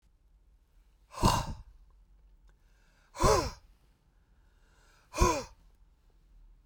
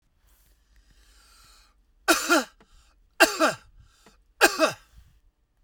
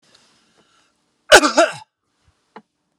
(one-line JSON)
{"exhalation_length": "6.7 s", "exhalation_amplitude": 9938, "exhalation_signal_mean_std_ratio": 0.3, "three_cough_length": "5.6 s", "three_cough_amplitude": 25437, "three_cough_signal_mean_std_ratio": 0.3, "cough_length": "3.0 s", "cough_amplitude": 32768, "cough_signal_mean_std_ratio": 0.24, "survey_phase": "beta (2021-08-13 to 2022-03-07)", "age": "45-64", "gender": "Male", "wearing_mask": "No", "symptom_none": true, "smoker_status": "Ex-smoker", "respiratory_condition_asthma": false, "respiratory_condition_other": false, "recruitment_source": "REACT", "submission_delay": "2 days", "covid_test_result": "Negative", "covid_test_method": "RT-qPCR"}